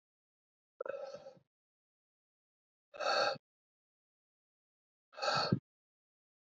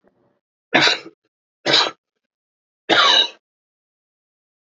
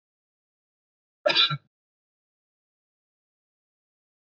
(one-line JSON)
{"exhalation_length": "6.5 s", "exhalation_amplitude": 4325, "exhalation_signal_mean_std_ratio": 0.3, "three_cough_length": "4.7 s", "three_cough_amplitude": 32767, "three_cough_signal_mean_std_ratio": 0.34, "cough_length": "4.3 s", "cough_amplitude": 15823, "cough_signal_mean_std_ratio": 0.19, "survey_phase": "beta (2021-08-13 to 2022-03-07)", "age": "18-44", "gender": "Male", "wearing_mask": "Yes", "symptom_cough_any": true, "symptom_new_continuous_cough": true, "symptom_runny_or_blocked_nose": true, "symptom_shortness_of_breath": true, "symptom_sore_throat": true, "symptom_headache": true, "symptom_onset": "3 days", "smoker_status": "Never smoked", "respiratory_condition_asthma": true, "respiratory_condition_other": false, "recruitment_source": "Test and Trace", "submission_delay": "1 day", "covid_test_result": "Positive", "covid_test_method": "RT-qPCR", "covid_ct_value": 23.0, "covid_ct_gene": "ORF1ab gene"}